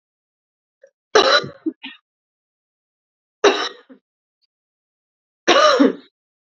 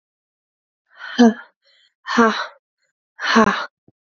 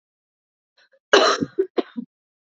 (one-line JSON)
{"three_cough_length": "6.6 s", "three_cough_amplitude": 32767, "three_cough_signal_mean_std_ratio": 0.31, "exhalation_length": "4.0 s", "exhalation_amplitude": 27840, "exhalation_signal_mean_std_ratio": 0.36, "cough_length": "2.6 s", "cough_amplitude": 29254, "cough_signal_mean_std_ratio": 0.31, "survey_phase": "beta (2021-08-13 to 2022-03-07)", "age": "18-44", "gender": "Female", "wearing_mask": "No", "symptom_cough_any": true, "symptom_runny_or_blocked_nose": true, "symptom_shortness_of_breath": true, "symptom_sore_throat": true, "symptom_diarrhoea": true, "symptom_fatigue": true, "symptom_headache": true, "symptom_other": true, "symptom_onset": "2 days", "smoker_status": "Never smoked", "respiratory_condition_asthma": false, "respiratory_condition_other": false, "recruitment_source": "Test and Trace", "submission_delay": "2 days", "covid_test_result": "Positive", "covid_test_method": "RT-qPCR", "covid_ct_value": 19.4, "covid_ct_gene": "ORF1ab gene", "covid_ct_mean": 19.8, "covid_viral_load": "330000 copies/ml", "covid_viral_load_category": "Low viral load (10K-1M copies/ml)"}